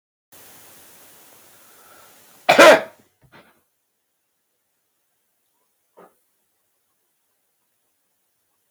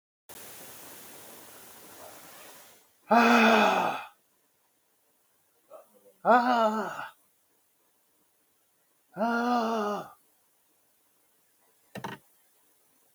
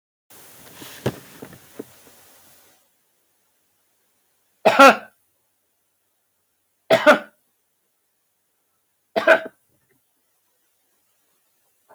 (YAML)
cough_length: 8.7 s
cough_amplitude: 32768
cough_signal_mean_std_ratio: 0.17
exhalation_length: 13.1 s
exhalation_amplitude: 13352
exhalation_signal_mean_std_ratio: 0.35
three_cough_length: 11.9 s
three_cough_amplitude: 32766
three_cough_signal_mean_std_ratio: 0.2
survey_phase: beta (2021-08-13 to 2022-03-07)
age: 65+
gender: Male
wearing_mask: 'No'
symptom_none: true
smoker_status: Never smoked
respiratory_condition_asthma: false
respiratory_condition_other: false
recruitment_source: REACT
submission_delay: 2 days
covid_test_result: Negative
covid_test_method: RT-qPCR
influenza_a_test_result: Negative
influenza_b_test_result: Negative